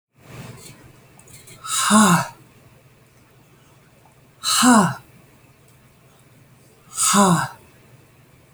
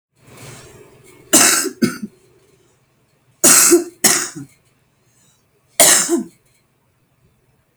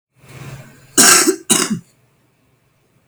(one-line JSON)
{"exhalation_length": "8.5 s", "exhalation_amplitude": 28163, "exhalation_signal_mean_std_ratio": 0.37, "three_cough_length": "7.8 s", "three_cough_amplitude": 32768, "three_cough_signal_mean_std_ratio": 0.36, "cough_length": "3.1 s", "cough_amplitude": 32768, "cough_signal_mean_std_ratio": 0.37, "survey_phase": "alpha (2021-03-01 to 2021-08-12)", "age": "45-64", "gender": "Female", "wearing_mask": "No", "symptom_none": true, "symptom_onset": "12 days", "smoker_status": "Current smoker (1 to 10 cigarettes per day)", "respiratory_condition_asthma": false, "respiratory_condition_other": false, "recruitment_source": "REACT", "submission_delay": "5 days", "covid_test_result": "Negative", "covid_test_method": "RT-qPCR"}